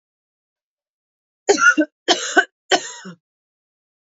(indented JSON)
{
  "three_cough_length": "4.2 s",
  "three_cough_amplitude": 27312,
  "three_cough_signal_mean_std_ratio": 0.31,
  "survey_phase": "beta (2021-08-13 to 2022-03-07)",
  "age": "18-44",
  "gender": "Female",
  "wearing_mask": "No",
  "symptom_runny_or_blocked_nose": true,
  "symptom_fatigue": true,
  "symptom_change_to_sense_of_smell_or_taste": true,
  "symptom_loss_of_taste": true,
  "symptom_other": true,
  "symptom_onset": "3 days",
  "smoker_status": "Current smoker (1 to 10 cigarettes per day)",
  "respiratory_condition_asthma": false,
  "respiratory_condition_other": false,
  "recruitment_source": "Test and Trace",
  "submission_delay": "2 days",
  "covid_test_result": "Positive",
  "covid_test_method": "RT-qPCR",
  "covid_ct_value": 20.7,
  "covid_ct_gene": "N gene"
}